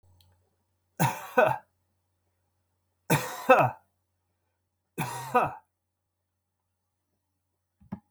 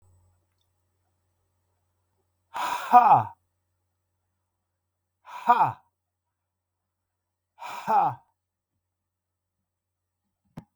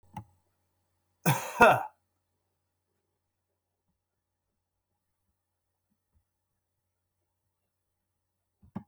{"three_cough_length": "8.1 s", "three_cough_amplitude": 18290, "three_cough_signal_mean_std_ratio": 0.28, "exhalation_length": "10.8 s", "exhalation_amplitude": 24235, "exhalation_signal_mean_std_ratio": 0.24, "cough_length": "8.9 s", "cough_amplitude": 16548, "cough_signal_mean_std_ratio": 0.16, "survey_phase": "beta (2021-08-13 to 2022-03-07)", "age": "65+", "gender": "Male", "wearing_mask": "No", "symptom_none": true, "smoker_status": "Never smoked", "respiratory_condition_asthma": false, "respiratory_condition_other": false, "recruitment_source": "REACT", "submission_delay": "1 day", "covid_test_result": "Negative", "covid_test_method": "RT-qPCR", "influenza_a_test_result": "Negative", "influenza_b_test_result": "Negative"}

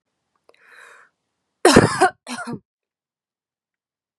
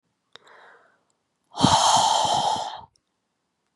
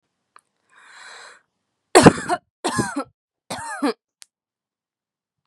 {"cough_length": "4.2 s", "cough_amplitude": 32768, "cough_signal_mean_std_ratio": 0.25, "exhalation_length": "3.8 s", "exhalation_amplitude": 22630, "exhalation_signal_mean_std_ratio": 0.46, "three_cough_length": "5.5 s", "three_cough_amplitude": 32768, "three_cough_signal_mean_std_ratio": 0.24, "survey_phase": "beta (2021-08-13 to 2022-03-07)", "age": "18-44", "gender": "Female", "wearing_mask": "No", "symptom_runny_or_blocked_nose": true, "symptom_onset": "12 days", "smoker_status": "Never smoked", "respiratory_condition_asthma": false, "respiratory_condition_other": false, "recruitment_source": "REACT", "submission_delay": "1 day", "covid_test_result": "Negative", "covid_test_method": "RT-qPCR", "influenza_a_test_result": "Negative", "influenza_b_test_result": "Negative"}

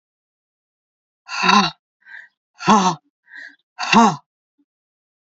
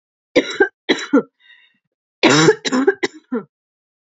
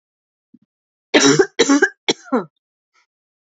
{"exhalation_length": "5.2 s", "exhalation_amplitude": 29196, "exhalation_signal_mean_std_ratio": 0.33, "cough_length": "4.1 s", "cough_amplitude": 30499, "cough_signal_mean_std_ratio": 0.41, "three_cough_length": "3.5 s", "three_cough_amplitude": 31192, "three_cough_signal_mean_std_ratio": 0.36, "survey_phase": "alpha (2021-03-01 to 2021-08-12)", "age": "45-64", "gender": "Female", "wearing_mask": "No", "symptom_cough_any": true, "symptom_fatigue": true, "symptom_headache": true, "symptom_change_to_sense_of_smell_or_taste": true, "symptom_onset": "3 days", "smoker_status": "Never smoked", "respiratory_condition_asthma": false, "respiratory_condition_other": false, "recruitment_source": "Test and Trace", "submission_delay": "1 day", "covid_test_result": "Positive", "covid_test_method": "RT-qPCR"}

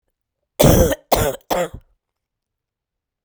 {"cough_length": "3.2 s", "cough_amplitude": 32768, "cough_signal_mean_std_ratio": 0.36, "survey_phase": "beta (2021-08-13 to 2022-03-07)", "age": "45-64", "gender": "Female", "wearing_mask": "No", "symptom_cough_any": true, "symptom_new_continuous_cough": true, "symptom_runny_or_blocked_nose": true, "symptom_shortness_of_breath": true, "symptom_sore_throat": true, "symptom_fatigue": true, "symptom_fever_high_temperature": true, "symptom_headache": true, "symptom_change_to_sense_of_smell_or_taste": true, "symptom_other": true, "symptom_onset": "3 days", "smoker_status": "Never smoked", "respiratory_condition_asthma": false, "respiratory_condition_other": false, "recruitment_source": "Test and Trace", "submission_delay": "2 days", "covid_test_result": "Positive", "covid_test_method": "RT-qPCR", "covid_ct_value": 26.8, "covid_ct_gene": "N gene"}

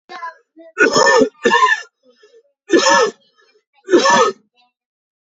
{"three_cough_length": "5.4 s", "three_cough_amplitude": 30369, "three_cough_signal_mean_std_ratio": 0.48, "survey_phase": "beta (2021-08-13 to 2022-03-07)", "age": "18-44", "gender": "Male", "wearing_mask": "No", "symptom_cough_any": true, "symptom_runny_or_blocked_nose": true, "symptom_fatigue": true, "symptom_other": true, "smoker_status": "Never smoked", "respiratory_condition_asthma": false, "respiratory_condition_other": false, "recruitment_source": "Test and Trace", "submission_delay": "2 days", "covid_test_result": "Positive", "covid_test_method": "ePCR"}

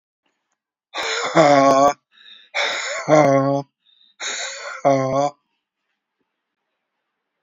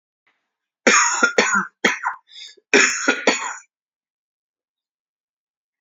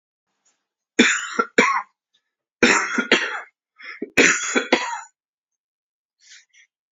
{"exhalation_length": "7.4 s", "exhalation_amplitude": 28411, "exhalation_signal_mean_std_ratio": 0.46, "cough_length": "5.8 s", "cough_amplitude": 30398, "cough_signal_mean_std_ratio": 0.4, "three_cough_length": "6.9 s", "three_cough_amplitude": 29458, "three_cough_signal_mean_std_ratio": 0.4, "survey_phase": "alpha (2021-03-01 to 2021-08-12)", "age": "65+", "gender": "Male", "wearing_mask": "No", "symptom_cough_any": true, "symptom_onset": "2 days", "smoker_status": "Never smoked", "respiratory_condition_asthma": false, "respiratory_condition_other": true, "recruitment_source": "REACT", "submission_delay": "1 day", "covid_test_result": "Negative", "covid_test_method": "RT-qPCR"}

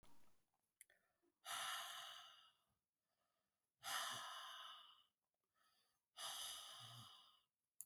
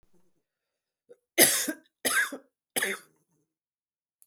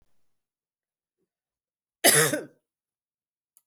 {"exhalation_length": "7.9 s", "exhalation_amplitude": 686, "exhalation_signal_mean_std_ratio": 0.52, "three_cough_length": "4.3 s", "three_cough_amplitude": 23200, "three_cough_signal_mean_std_ratio": 0.31, "cough_length": "3.7 s", "cough_amplitude": 21412, "cough_signal_mean_std_ratio": 0.23, "survey_phase": "beta (2021-08-13 to 2022-03-07)", "age": "45-64", "gender": "Female", "wearing_mask": "No", "symptom_cough_any": true, "symptom_runny_or_blocked_nose": true, "symptom_sore_throat": true, "symptom_fatigue": true, "symptom_headache": true, "smoker_status": "Never smoked", "respiratory_condition_asthma": false, "respiratory_condition_other": false, "recruitment_source": "REACT", "submission_delay": "2 days", "covid_test_result": "Negative", "covid_test_method": "RT-qPCR"}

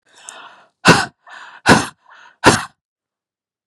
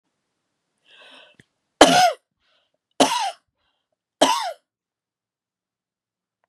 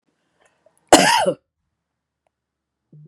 {"exhalation_length": "3.7 s", "exhalation_amplitude": 32768, "exhalation_signal_mean_std_ratio": 0.3, "three_cough_length": "6.5 s", "three_cough_amplitude": 32768, "three_cough_signal_mean_std_ratio": 0.26, "cough_length": "3.1 s", "cough_amplitude": 32768, "cough_signal_mean_std_ratio": 0.27, "survey_phase": "beta (2021-08-13 to 2022-03-07)", "age": "45-64", "gender": "Female", "wearing_mask": "No", "symptom_shortness_of_breath": true, "smoker_status": "Never smoked", "respiratory_condition_asthma": true, "respiratory_condition_other": false, "recruitment_source": "REACT", "submission_delay": "1 day", "covid_test_result": "Negative", "covid_test_method": "RT-qPCR", "influenza_a_test_result": "Negative", "influenza_b_test_result": "Negative"}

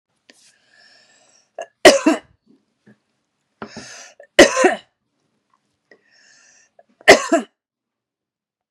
{"three_cough_length": "8.7 s", "three_cough_amplitude": 32768, "three_cough_signal_mean_std_ratio": 0.23, "survey_phase": "beta (2021-08-13 to 2022-03-07)", "age": "45-64", "gender": "Female", "wearing_mask": "No", "symptom_none": true, "smoker_status": "Never smoked", "respiratory_condition_asthma": false, "respiratory_condition_other": false, "recruitment_source": "REACT", "submission_delay": "2 days", "covid_test_result": "Negative", "covid_test_method": "RT-qPCR", "influenza_a_test_result": "Negative", "influenza_b_test_result": "Negative"}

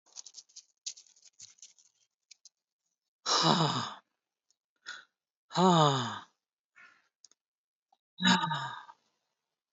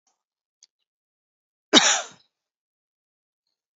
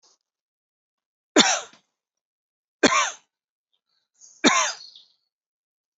{"exhalation_length": "9.7 s", "exhalation_amplitude": 12814, "exhalation_signal_mean_std_ratio": 0.33, "cough_length": "3.8 s", "cough_amplitude": 28073, "cough_signal_mean_std_ratio": 0.19, "three_cough_length": "6.0 s", "three_cough_amplitude": 26807, "three_cough_signal_mean_std_ratio": 0.27, "survey_phase": "beta (2021-08-13 to 2022-03-07)", "age": "45-64", "gender": "Female", "wearing_mask": "No", "symptom_none": true, "smoker_status": "Never smoked", "respiratory_condition_asthma": false, "respiratory_condition_other": false, "recruitment_source": "REACT", "submission_delay": "8 days", "covid_test_result": "Negative", "covid_test_method": "RT-qPCR"}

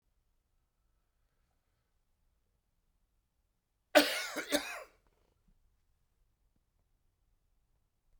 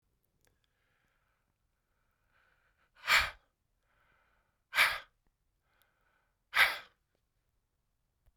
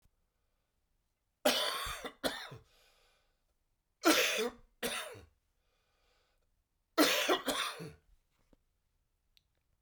{"cough_length": "8.2 s", "cough_amplitude": 12212, "cough_signal_mean_std_ratio": 0.18, "exhalation_length": "8.4 s", "exhalation_amplitude": 9461, "exhalation_signal_mean_std_ratio": 0.21, "three_cough_length": "9.8 s", "three_cough_amplitude": 7306, "three_cough_signal_mean_std_ratio": 0.35, "survey_phase": "beta (2021-08-13 to 2022-03-07)", "age": "65+", "gender": "Male", "wearing_mask": "No", "symptom_cough_any": true, "symptom_runny_or_blocked_nose": true, "symptom_fatigue": true, "symptom_fever_high_temperature": true, "symptom_onset": "5 days", "smoker_status": "Never smoked", "respiratory_condition_asthma": false, "respiratory_condition_other": false, "recruitment_source": "Test and Trace", "submission_delay": "2 days", "covid_test_result": "Positive", "covid_test_method": "RT-qPCR", "covid_ct_value": 10.9, "covid_ct_gene": "N gene", "covid_ct_mean": 11.4, "covid_viral_load": "190000000 copies/ml", "covid_viral_load_category": "High viral load (>1M copies/ml)"}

